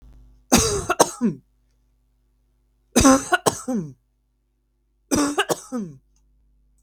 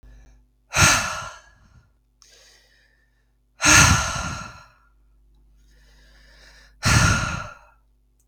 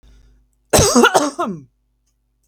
{
  "three_cough_length": "6.8 s",
  "three_cough_amplitude": 32768,
  "three_cough_signal_mean_std_ratio": 0.37,
  "exhalation_length": "8.3 s",
  "exhalation_amplitude": 31568,
  "exhalation_signal_mean_std_ratio": 0.36,
  "cough_length": "2.5 s",
  "cough_amplitude": 32768,
  "cough_signal_mean_std_ratio": 0.41,
  "survey_phase": "beta (2021-08-13 to 2022-03-07)",
  "age": "18-44",
  "gender": "Female",
  "wearing_mask": "No",
  "symptom_none": true,
  "smoker_status": "Never smoked",
  "respiratory_condition_asthma": false,
  "respiratory_condition_other": false,
  "recruitment_source": "REACT",
  "submission_delay": "5 days",
  "covid_test_result": "Negative",
  "covid_test_method": "RT-qPCR",
  "influenza_a_test_result": "Negative",
  "influenza_b_test_result": "Negative"
}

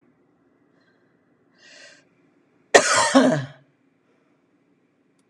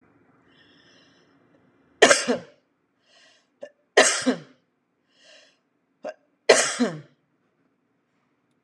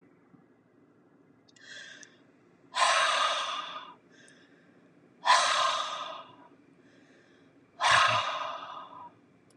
{
  "cough_length": "5.3 s",
  "cough_amplitude": 32768,
  "cough_signal_mean_std_ratio": 0.27,
  "three_cough_length": "8.6 s",
  "three_cough_amplitude": 32419,
  "three_cough_signal_mean_std_ratio": 0.25,
  "exhalation_length": "9.6 s",
  "exhalation_amplitude": 10725,
  "exhalation_signal_mean_std_ratio": 0.44,
  "survey_phase": "beta (2021-08-13 to 2022-03-07)",
  "age": "65+",
  "gender": "Female",
  "wearing_mask": "No",
  "symptom_none": true,
  "smoker_status": "Ex-smoker",
  "respiratory_condition_asthma": false,
  "respiratory_condition_other": false,
  "recruitment_source": "REACT",
  "submission_delay": "2 days",
  "covid_test_result": "Negative",
  "covid_test_method": "RT-qPCR",
  "influenza_a_test_result": "Negative",
  "influenza_b_test_result": "Negative"
}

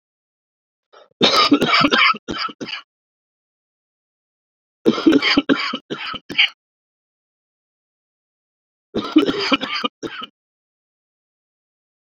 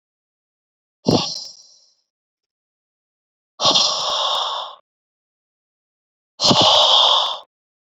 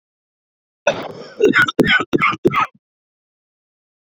{
  "three_cough_length": "12.0 s",
  "three_cough_amplitude": 30429,
  "three_cough_signal_mean_std_ratio": 0.37,
  "exhalation_length": "7.9 s",
  "exhalation_amplitude": 28020,
  "exhalation_signal_mean_std_ratio": 0.42,
  "cough_length": "4.1 s",
  "cough_amplitude": 27638,
  "cough_signal_mean_std_ratio": 0.41,
  "survey_phase": "beta (2021-08-13 to 2022-03-07)",
  "age": "18-44",
  "gender": "Male",
  "wearing_mask": "No",
  "symptom_cough_any": true,
  "symptom_runny_or_blocked_nose": true,
  "symptom_sore_throat": true,
  "symptom_fatigue": true,
  "symptom_headache": true,
  "smoker_status": "Ex-smoker",
  "respiratory_condition_asthma": false,
  "respiratory_condition_other": false,
  "recruitment_source": "Test and Trace",
  "submission_delay": "1 day",
  "covid_test_result": "Positive",
  "covid_test_method": "RT-qPCR"
}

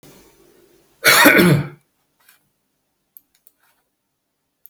{
  "cough_length": "4.7 s",
  "cough_amplitude": 32768,
  "cough_signal_mean_std_ratio": 0.3,
  "survey_phase": "beta (2021-08-13 to 2022-03-07)",
  "age": "45-64",
  "gender": "Male",
  "wearing_mask": "No",
  "symptom_sore_throat": true,
  "symptom_fatigue": true,
  "symptom_headache": true,
  "symptom_onset": "5 days",
  "smoker_status": "Ex-smoker",
  "respiratory_condition_asthma": false,
  "respiratory_condition_other": false,
  "recruitment_source": "REACT",
  "submission_delay": "0 days",
  "covid_test_result": "Positive",
  "covid_test_method": "RT-qPCR",
  "covid_ct_value": 27.2,
  "covid_ct_gene": "E gene",
  "influenza_a_test_result": "Negative",
  "influenza_b_test_result": "Negative"
}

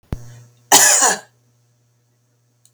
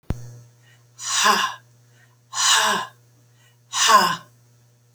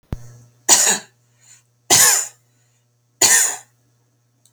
{
  "cough_length": "2.7 s",
  "cough_amplitude": 32768,
  "cough_signal_mean_std_ratio": 0.35,
  "exhalation_length": "4.9 s",
  "exhalation_amplitude": 26780,
  "exhalation_signal_mean_std_ratio": 0.45,
  "three_cough_length": "4.5 s",
  "three_cough_amplitude": 32768,
  "three_cough_signal_mean_std_ratio": 0.38,
  "survey_phase": "alpha (2021-03-01 to 2021-08-12)",
  "age": "65+",
  "gender": "Female",
  "wearing_mask": "No",
  "symptom_none": true,
  "smoker_status": "Never smoked",
  "respiratory_condition_asthma": false,
  "respiratory_condition_other": false,
  "recruitment_source": "REACT",
  "submission_delay": "3 days",
  "covid_test_result": "Negative",
  "covid_test_method": "RT-qPCR"
}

